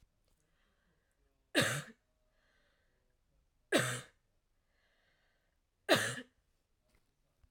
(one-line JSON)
{"three_cough_length": "7.5 s", "three_cough_amplitude": 6446, "three_cough_signal_mean_std_ratio": 0.25, "survey_phase": "alpha (2021-03-01 to 2021-08-12)", "age": "18-44", "gender": "Female", "wearing_mask": "No", "symptom_none": true, "smoker_status": "Current smoker (1 to 10 cigarettes per day)", "respiratory_condition_asthma": false, "respiratory_condition_other": false, "recruitment_source": "REACT", "submission_delay": "1 day", "covid_test_result": "Negative", "covid_test_method": "RT-qPCR"}